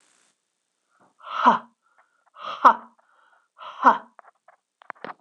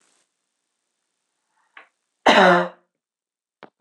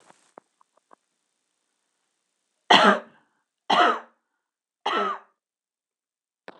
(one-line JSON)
{"exhalation_length": "5.2 s", "exhalation_amplitude": 26027, "exhalation_signal_mean_std_ratio": 0.24, "cough_length": "3.8 s", "cough_amplitude": 26027, "cough_signal_mean_std_ratio": 0.26, "three_cough_length": "6.6 s", "three_cough_amplitude": 25994, "three_cough_signal_mean_std_ratio": 0.26, "survey_phase": "beta (2021-08-13 to 2022-03-07)", "age": "18-44", "gender": "Female", "wearing_mask": "No", "symptom_none": true, "smoker_status": "Ex-smoker", "respiratory_condition_asthma": false, "respiratory_condition_other": false, "recruitment_source": "REACT", "submission_delay": "1 day", "covid_test_result": "Negative", "covid_test_method": "RT-qPCR"}